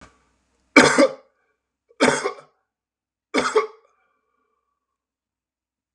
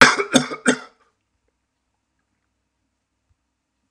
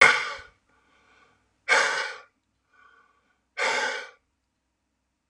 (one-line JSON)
{"three_cough_length": "5.9 s", "three_cough_amplitude": 32768, "three_cough_signal_mean_std_ratio": 0.28, "cough_length": "3.9 s", "cough_amplitude": 32768, "cough_signal_mean_std_ratio": 0.24, "exhalation_length": "5.3 s", "exhalation_amplitude": 29662, "exhalation_signal_mean_std_ratio": 0.33, "survey_phase": "beta (2021-08-13 to 2022-03-07)", "age": "65+", "gender": "Male", "wearing_mask": "No", "symptom_none": true, "symptom_onset": "12 days", "smoker_status": "Never smoked", "respiratory_condition_asthma": false, "respiratory_condition_other": false, "recruitment_source": "REACT", "submission_delay": "0 days", "covid_test_result": "Negative", "covid_test_method": "RT-qPCR"}